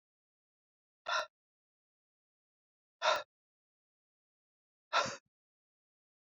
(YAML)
exhalation_length: 6.3 s
exhalation_amplitude: 4679
exhalation_signal_mean_std_ratio: 0.22
survey_phase: beta (2021-08-13 to 2022-03-07)
age: 45-64
gender: Female
wearing_mask: 'No'
symptom_cough_any: true
symptom_runny_or_blocked_nose: true
symptom_onset: 3 days
smoker_status: Ex-smoker
respiratory_condition_asthma: false
respiratory_condition_other: false
recruitment_source: Test and Trace
submission_delay: 2 days
covid_test_result: Positive
covid_test_method: RT-qPCR
covid_ct_value: 15.9
covid_ct_gene: ORF1ab gene
covid_ct_mean: 16.1
covid_viral_load: 5300000 copies/ml
covid_viral_load_category: High viral load (>1M copies/ml)